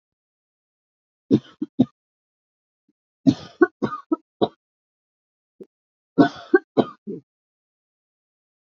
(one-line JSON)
{"three_cough_length": "8.7 s", "three_cough_amplitude": 26413, "three_cough_signal_mean_std_ratio": 0.21, "survey_phase": "beta (2021-08-13 to 2022-03-07)", "age": "45-64", "gender": "Female", "wearing_mask": "No", "symptom_cough_any": true, "symptom_runny_or_blocked_nose": true, "symptom_shortness_of_breath": true, "symptom_abdominal_pain": true, "symptom_diarrhoea": true, "symptom_fatigue": true, "symptom_fever_high_temperature": true, "symptom_headache": true, "symptom_other": true, "symptom_onset": "3 days", "smoker_status": "Never smoked", "respiratory_condition_asthma": false, "respiratory_condition_other": false, "recruitment_source": "Test and Trace", "submission_delay": "2 days", "covid_test_result": "Positive", "covid_test_method": "RT-qPCR", "covid_ct_value": 23.3, "covid_ct_gene": "ORF1ab gene"}